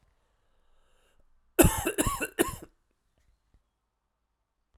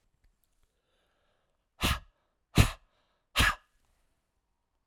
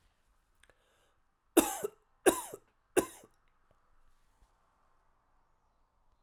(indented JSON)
{
  "cough_length": "4.8 s",
  "cough_amplitude": 21466,
  "cough_signal_mean_std_ratio": 0.26,
  "exhalation_length": "4.9 s",
  "exhalation_amplitude": 18220,
  "exhalation_signal_mean_std_ratio": 0.23,
  "three_cough_length": "6.2 s",
  "three_cough_amplitude": 13726,
  "three_cough_signal_mean_std_ratio": 0.19,
  "survey_phase": "alpha (2021-03-01 to 2021-08-12)",
  "age": "45-64",
  "gender": "Male",
  "wearing_mask": "No",
  "symptom_cough_any": true,
  "symptom_change_to_sense_of_smell_or_taste": true,
  "symptom_loss_of_taste": true,
  "symptom_onset": "6 days",
  "smoker_status": "Ex-smoker",
  "respiratory_condition_asthma": false,
  "respiratory_condition_other": false,
  "recruitment_source": "Test and Trace",
  "submission_delay": "1 day",
  "covid_test_result": "Positive",
  "covid_test_method": "RT-qPCR",
  "covid_ct_value": 15.6,
  "covid_ct_gene": "ORF1ab gene",
  "covid_ct_mean": 16.2,
  "covid_viral_load": "4700000 copies/ml",
  "covid_viral_load_category": "High viral load (>1M copies/ml)"
}